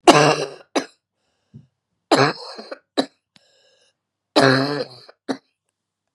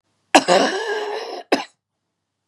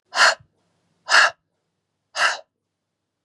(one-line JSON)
{"three_cough_length": "6.1 s", "three_cough_amplitude": 32768, "three_cough_signal_mean_std_ratio": 0.32, "cough_length": "2.5 s", "cough_amplitude": 32768, "cough_signal_mean_std_ratio": 0.43, "exhalation_length": "3.2 s", "exhalation_amplitude": 28876, "exhalation_signal_mean_std_ratio": 0.32, "survey_phase": "beta (2021-08-13 to 2022-03-07)", "age": "45-64", "gender": "Female", "wearing_mask": "No", "symptom_runny_or_blocked_nose": true, "symptom_sore_throat": true, "symptom_fatigue": true, "smoker_status": "Never smoked", "respiratory_condition_asthma": true, "respiratory_condition_other": false, "recruitment_source": "Test and Trace", "submission_delay": "2 days", "covid_test_result": "Positive", "covid_test_method": "RT-qPCR", "covid_ct_value": 19.0, "covid_ct_gene": "ORF1ab gene"}